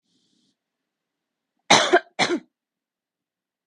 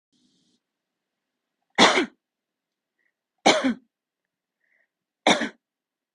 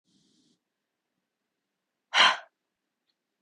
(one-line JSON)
{"cough_length": "3.7 s", "cough_amplitude": 31952, "cough_signal_mean_std_ratio": 0.25, "three_cough_length": "6.1 s", "three_cough_amplitude": 32205, "three_cough_signal_mean_std_ratio": 0.25, "exhalation_length": "3.4 s", "exhalation_amplitude": 14934, "exhalation_signal_mean_std_ratio": 0.19, "survey_phase": "beta (2021-08-13 to 2022-03-07)", "age": "18-44", "gender": "Female", "wearing_mask": "No", "symptom_headache": true, "smoker_status": "Never smoked", "respiratory_condition_asthma": false, "respiratory_condition_other": false, "recruitment_source": "REACT", "submission_delay": "1 day", "covid_test_result": "Negative", "covid_test_method": "RT-qPCR", "influenza_a_test_result": "Negative", "influenza_b_test_result": "Negative"}